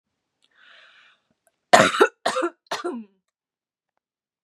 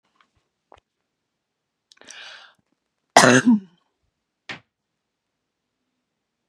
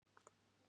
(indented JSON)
{
  "three_cough_length": "4.4 s",
  "three_cough_amplitude": 32768,
  "three_cough_signal_mean_std_ratio": 0.27,
  "cough_length": "6.5 s",
  "cough_amplitude": 32768,
  "cough_signal_mean_std_ratio": 0.2,
  "exhalation_length": "0.7 s",
  "exhalation_amplitude": 216,
  "exhalation_signal_mean_std_ratio": 0.55,
  "survey_phase": "beta (2021-08-13 to 2022-03-07)",
  "age": "18-44",
  "gender": "Female",
  "wearing_mask": "No",
  "symptom_none": true,
  "smoker_status": "Never smoked",
  "respiratory_condition_asthma": false,
  "respiratory_condition_other": false,
  "recruitment_source": "REACT",
  "submission_delay": "0 days",
  "covid_test_result": "Negative",
  "covid_test_method": "RT-qPCR"
}